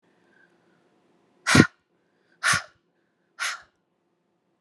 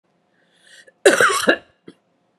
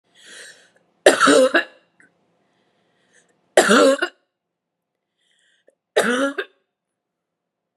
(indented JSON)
{
  "exhalation_length": "4.6 s",
  "exhalation_amplitude": 32491,
  "exhalation_signal_mean_std_ratio": 0.22,
  "cough_length": "2.4 s",
  "cough_amplitude": 32709,
  "cough_signal_mean_std_ratio": 0.34,
  "three_cough_length": "7.8 s",
  "three_cough_amplitude": 32768,
  "three_cough_signal_mean_std_ratio": 0.33,
  "survey_phase": "beta (2021-08-13 to 2022-03-07)",
  "age": "45-64",
  "gender": "Female",
  "wearing_mask": "No",
  "symptom_cough_any": true,
  "symptom_runny_or_blocked_nose": true,
  "symptom_shortness_of_breath": true,
  "symptom_sore_throat": true,
  "symptom_abdominal_pain": true,
  "symptom_fatigue": true,
  "symptom_onset": "7 days",
  "smoker_status": "Never smoked",
  "respiratory_condition_asthma": false,
  "respiratory_condition_other": false,
  "recruitment_source": "Test and Trace",
  "submission_delay": "4 days",
  "covid_test_result": "Positive",
  "covid_test_method": "RT-qPCR"
}